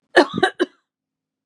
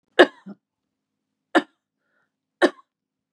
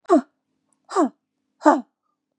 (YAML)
cough_length: 1.5 s
cough_amplitude: 32767
cough_signal_mean_std_ratio: 0.31
three_cough_length: 3.3 s
three_cough_amplitude: 32748
three_cough_signal_mean_std_ratio: 0.18
exhalation_length: 2.4 s
exhalation_amplitude: 29294
exhalation_signal_mean_std_ratio: 0.32
survey_phase: beta (2021-08-13 to 2022-03-07)
age: 45-64
gender: Female
wearing_mask: 'No'
symptom_none: true
smoker_status: Ex-smoker
respiratory_condition_asthma: false
respiratory_condition_other: false
recruitment_source: REACT
submission_delay: 2 days
covid_test_result: Negative
covid_test_method: RT-qPCR
influenza_a_test_result: Negative
influenza_b_test_result: Negative